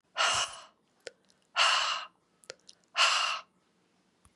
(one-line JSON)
{"exhalation_length": "4.4 s", "exhalation_amplitude": 9987, "exhalation_signal_mean_std_ratio": 0.44, "survey_phase": "beta (2021-08-13 to 2022-03-07)", "age": "45-64", "gender": "Female", "wearing_mask": "No", "symptom_cough_any": true, "symptom_onset": "3 days", "smoker_status": "Never smoked", "respiratory_condition_asthma": false, "respiratory_condition_other": false, "recruitment_source": "Test and Trace", "submission_delay": "2 days", "covid_test_result": "Positive", "covid_test_method": "RT-qPCR", "covid_ct_value": 15.5, "covid_ct_gene": "N gene", "covid_ct_mean": 15.7, "covid_viral_load": "6900000 copies/ml", "covid_viral_load_category": "High viral load (>1M copies/ml)"}